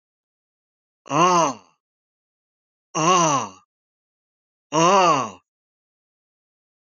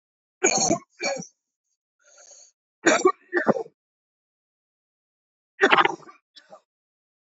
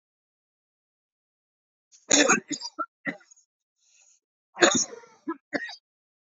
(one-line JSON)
{"exhalation_length": "6.8 s", "exhalation_amplitude": 20337, "exhalation_signal_mean_std_ratio": 0.38, "three_cough_length": "7.3 s", "three_cough_amplitude": 26286, "three_cough_signal_mean_std_ratio": 0.31, "cough_length": "6.2 s", "cough_amplitude": 27055, "cough_signal_mean_std_ratio": 0.28, "survey_phase": "alpha (2021-03-01 to 2021-08-12)", "age": "45-64", "gender": "Male", "wearing_mask": "Yes", "symptom_new_continuous_cough": true, "symptom_headache": true, "symptom_onset": "3 days", "smoker_status": "Never smoked", "respiratory_condition_asthma": false, "respiratory_condition_other": false, "recruitment_source": "Test and Trace", "submission_delay": "2 days", "covid_test_result": "Positive", "covid_test_method": "RT-qPCR", "covid_ct_value": 23.5, "covid_ct_gene": "N gene", "covid_ct_mean": 23.9, "covid_viral_load": "14000 copies/ml", "covid_viral_load_category": "Low viral load (10K-1M copies/ml)"}